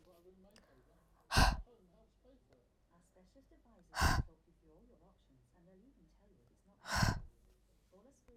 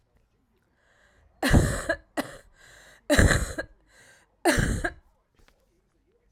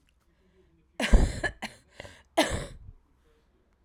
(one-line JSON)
{"exhalation_length": "8.4 s", "exhalation_amplitude": 5363, "exhalation_signal_mean_std_ratio": 0.27, "three_cough_length": "6.3 s", "three_cough_amplitude": 19376, "three_cough_signal_mean_std_ratio": 0.37, "cough_length": "3.8 s", "cough_amplitude": 17411, "cough_signal_mean_std_ratio": 0.3, "survey_phase": "alpha (2021-03-01 to 2021-08-12)", "age": "45-64", "gender": "Female", "wearing_mask": "No", "symptom_cough_any": true, "symptom_diarrhoea": true, "symptom_fatigue": true, "symptom_headache": true, "symptom_change_to_sense_of_smell_or_taste": true, "symptom_loss_of_taste": true, "symptom_onset": "6 days", "smoker_status": "Current smoker (1 to 10 cigarettes per day)", "respiratory_condition_asthma": false, "respiratory_condition_other": false, "recruitment_source": "Test and Trace", "submission_delay": "2 days", "covid_test_result": "Positive", "covid_test_method": "RT-qPCR", "covid_ct_value": 17.3, "covid_ct_gene": "ORF1ab gene", "covid_ct_mean": 18.1, "covid_viral_load": "1200000 copies/ml", "covid_viral_load_category": "High viral load (>1M copies/ml)"}